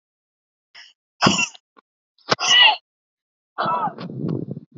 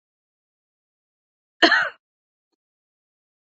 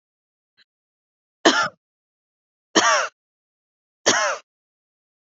{"exhalation_length": "4.8 s", "exhalation_amplitude": 27681, "exhalation_signal_mean_std_ratio": 0.4, "cough_length": "3.6 s", "cough_amplitude": 27483, "cough_signal_mean_std_ratio": 0.2, "three_cough_length": "5.2 s", "three_cough_amplitude": 29452, "three_cough_signal_mean_std_ratio": 0.3, "survey_phase": "beta (2021-08-13 to 2022-03-07)", "age": "18-44", "gender": "Female", "wearing_mask": "No", "symptom_none": true, "smoker_status": "Never smoked", "respiratory_condition_asthma": false, "respiratory_condition_other": false, "recruitment_source": "REACT", "submission_delay": "4 days", "covid_test_result": "Negative", "covid_test_method": "RT-qPCR", "influenza_a_test_result": "Negative", "influenza_b_test_result": "Negative"}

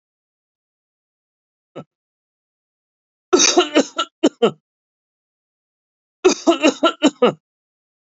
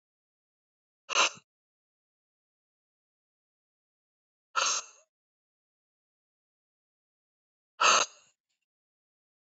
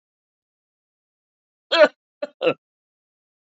{"three_cough_length": "8.0 s", "three_cough_amplitude": 31271, "three_cough_signal_mean_std_ratio": 0.3, "exhalation_length": "9.5 s", "exhalation_amplitude": 9997, "exhalation_signal_mean_std_ratio": 0.2, "cough_length": "3.5 s", "cough_amplitude": 28307, "cough_signal_mean_std_ratio": 0.21, "survey_phase": "alpha (2021-03-01 to 2021-08-12)", "age": "45-64", "gender": "Male", "wearing_mask": "No", "symptom_none": true, "smoker_status": "Never smoked", "respiratory_condition_asthma": false, "respiratory_condition_other": false, "recruitment_source": "REACT", "submission_delay": "2 days", "covid_test_result": "Negative", "covid_test_method": "RT-qPCR"}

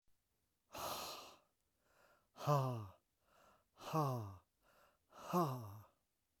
{"exhalation_length": "6.4 s", "exhalation_amplitude": 2539, "exhalation_signal_mean_std_ratio": 0.42, "survey_phase": "alpha (2021-03-01 to 2021-08-12)", "age": "65+", "gender": "Male", "wearing_mask": "No", "symptom_cough_any": true, "symptom_headache": true, "smoker_status": "Never smoked", "respiratory_condition_asthma": false, "respiratory_condition_other": false, "recruitment_source": "Test and Trace", "submission_delay": "2 days", "covid_test_result": "Positive", "covid_test_method": "RT-qPCR"}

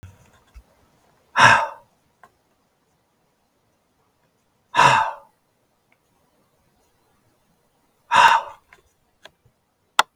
{"exhalation_length": "10.2 s", "exhalation_amplitude": 32768, "exhalation_signal_mean_std_ratio": 0.25, "survey_phase": "beta (2021-08-13 to 2022-03-07)", "age": "65+", "gender": "Male", "wearing_mask": "No", "symptom_none": true, "smoker_status": "Ex-smoker", "respiratory_condition_asthma": false, "respiratory_condition_other": false, "recruitment_source": "REACT", "submission_delay": "2 days", "covid_test_result": "Negative", "covid_test_method": "RT-qPCR", "influenza_a_test_result": "Negative", "influenza_b_test_result": "Negative"}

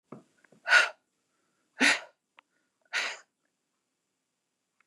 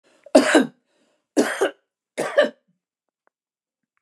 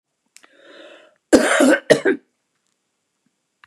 {"exhalation_length": "4.9 s", "exhalation_amplitude": 14153, "exhalation_signal_mean_std_ratio": 0.25, "three_cough_length": "4.0 s", "three_cough_amplitude": 29203, "three_cough_signal_mean_std_ratio": 0.33, "cough_length": "3.7 s", "cough_amplitude": 29204, "cough_signal_mean_std_ratio": 0.33, "survey_phase": "beta (2021-08-13 to 2022-03-07)", "age": "65+", "gender": "Female", "wearing_mask": "No", "symptom_none": true, "smoker_status": "Ex-smoker", "respiratory_condition_asthma": false, "respiratory_condition_other": false, "recruitment_source": "REACT", "submission_delay": "1 day", "covid_test_result": "Negative", "covid_test_method": "RT-qPCR", "influenza_a_test_result": "Negative", "influenza_b_test_result": "Negative"}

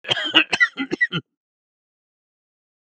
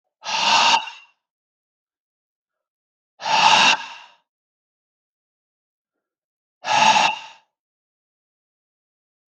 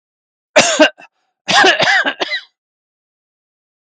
{"three_cough_length": "3.0 s", "three_cough_amplitude": 32178, "three_cough_signal_mean_std_ratio": 0.34, "exhalation_length": "9.3 s", "exhalation_amplitude": 31755, "exhalation_signal_mean_std_ratio": 0.34, "cough_length": "3.8 s", "cough_amplitude": 32768, "cough_signal_mean_std_ratio": 0.43, "survey_phase": "beta (2021-08-13 to 2022-03-07)", "age": "65+", "gender": "Male", "wearing_mask": "No", "symptom_none": true, "smoker_status": "Never smoked", "respiratory_condition_asthma": false, "respiratory_condition_other": false, "recruitment_source": "REACT", "submission_delay": "1 day", "covid_test_result": "Negative", "covid_test_method": "RT-qPCR"}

